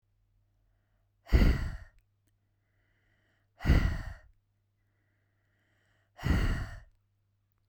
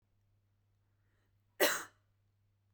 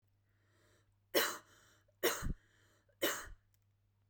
{
  "exhalation_length": "7.7 s",
  "exhalation_amplitude": 9388,
  "exhalation_signal_mean_std_ratio": 0.31,
  "cough_length": "2.7 s",
  "cough_amplitude": 6264,
  "cough_signal_mean_std_ratio": 0.22,
  "three_cough_length": "4.1 s",
  "three_cough_amplitude": 4429,
  "three_cough_signal_mean_std_ratio": 0.33,
  "survey_phase": "beta (2021-08-13 to 2022-03-07)",
  "age": "18-44",
  "gender": "Female",
  "wearing_mask": "No",
  "symptom_none": true,
  "smoker_status": "Never smoked",
  "respiratory_condition_asthma": false,
  "respiratory_condition_other": false,
  "recruitment_source": "REACT",
  "submission_delay": "2 days",
  "covid_test_result": "Negative",
  "covid_test_method": "RT-qPCR"
}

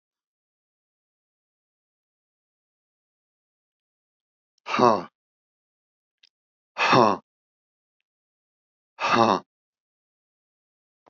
{
  "exhalation_length": "11.1 s",
  "exhalation_amplitude": 22610,
  "exhalation_signal_mean_std_ratio": 0.22,
  "survey_phase": "alpha (2021-03-01 to 2021-08-12)",
  "age": "65+",
  "gender": "Male",
  "wearing_mask": "No",
  "symptom_none": true,
  "smoker_status": "Never smoked",
  "respiratory_condition_asthma": false,
  "respiratory_condition_other": false,
  "recruitment_source": "REACT",
  "submission_delay": "1 day",
  "covid_test_result": "Negative",
  "covid_test_method": "RT-qPCR"
}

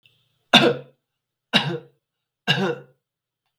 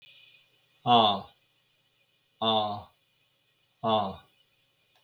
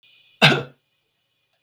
{
  "three_cough_length": "3.6 s",
  "three_cough_amplitude": 32768,
  "three_cough_signal_mean_std_ratio": 0.32,
  "exhalation_length": "5.0 s",
  "exhalation_amplitude": 12091,
  "exhalation_signal_mean_std_ratio": 0.35,
  "cough_length": "1.6 s",
  "cough_amplitude": 32768,
  "cough_signal_mean_std_ratio": 0.26,
  "survey_phase": "beta (2021-08-13 to 2022-03-07)",
  "age": "65+",
  "gender": "Male",
  "wearing_mask": "No",
  "symptom_none": true,
  "symptom_onset": "12 days",
  "smoker_status": "Never smoked",
  "respiratory_condition_asthma": false,
  "respiratory_condition_other": false,
  "recruitment_source": "REACT",
  "submission_delay": "4 days",
  "covid_test_result": "Negative",
  "covid_test_method": "RT-qPCR",
  "influenza_a_test_result": "Negative",
  "influenza_b_test_result": "Negative"
}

